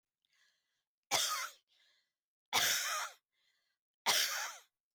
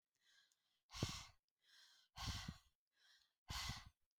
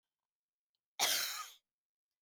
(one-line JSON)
{"three_cough_length": "4.9 s", "three_cough_amplitude": 5105, "three_cough_signal_mean_std_ratio": 0.42, "exhalation_length": "4.2 s", "exhalation_amplitude": 1579, "exhalation_signal_mean_std_ratio": 0.41, "cough_length": "2.2 s", "cough_amplitude": 3512, "cough_signal_mean_std_ratio": 0.35, "survey_phase": "alpha (2021-03-01 to 2021-08-12)", "age": "65+", "gender": "Female", "wearing_mask": "No", "symptom_none": true, "smoker_status": "Never smoked", "respiratory_condition_asthma": false, "respiratory_condition_other": false, "recruitment_source": "REACT", "submission_delay": "16 days", "covid_test_result": "Negative", "covid_test_method": "RT-qPCR"}